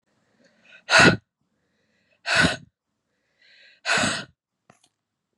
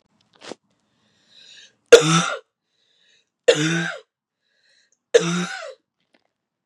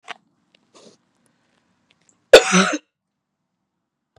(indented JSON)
{
  "exhalation_length": "5.4 s",
  "exhalation_amplitude": 27598,
  "exhalation_signal_mean_std_ratio": 0.3,
  "three_cough_length": "6.7 s",
  "three_cough_amplitude": 32768,
  "three_cough_signal_mean_std_ratio": 0.27,
  "cough_length": "4.2 s",
  "cough_amplitude": 32768,
  "cough_signal_mean_std_ratio": 0.2,
  "survey_phase": "beta (2021-08-13 to 2022-03-07)",
  "age": "18-44",
  "gender": "Female",
  "wearing_mask": "No",
  "symptom_cough_any": true,
  "symptom_sore_throat": true,
  "symptom_abdominal_pain": true,
  "symptom_fatigue": true,
  "symptom_fever_high_temperature": true,
  "symptom_headache": true,
  "symptom_onset": "3 days",
  "smoker_status": "Never smoked",
  "respiratory_condition_asthma": false,
  "respiratory_condition_other": false,
  "recruitment_source": "Test and Trace",
  "submission_delay": "2 days",
  "covid_test_result": "Positive",
  "covid_test_method": "RT-qPCR",
  "covid_ct_value": 20.3,
  "covid_ct_gene": "ORF1ab gene",
  "covid_ct_mean": 20.6,
  "covid_viral_load": "170000 copies/ml",
  "covid_viral_load_category": "Low viral load (10K-1M copies/ml)"
}